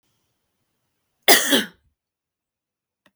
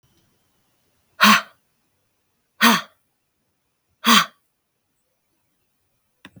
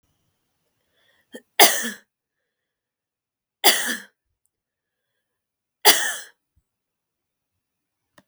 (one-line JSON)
{"cough_length": "3.2 s", "cough_amplitude": 32768, "cough_signal_mean_std_ratio": 0.23, "exhalation_length": "6.4 s", "exhalation_amplitude": 32768, "exhalation_signal_mean_std_ratio": 0.24, "three_cough_length": "8.3 s", "three_cough_amplitude": 32768, "three_cough_signal_mean_std_ratio": 0.21, "survey_phase": "beta (2021-08-13 to 2022-03-07)", "age": "18-44", "gender": "Female", "wearing_mask": "No", "symptom_none": true, "smoker_status": "Never smoked", "respiratory_condition_asthma": false, "respiratory_condition_other": false, "recruitment_source": "REACT", "submission_delay": "1 day", "covid_test_result": "Negative", "covid_test_method": "RT-qPCR", "influenza_a_test_result": "Negative", "influenza_b_test_result": "Negative"}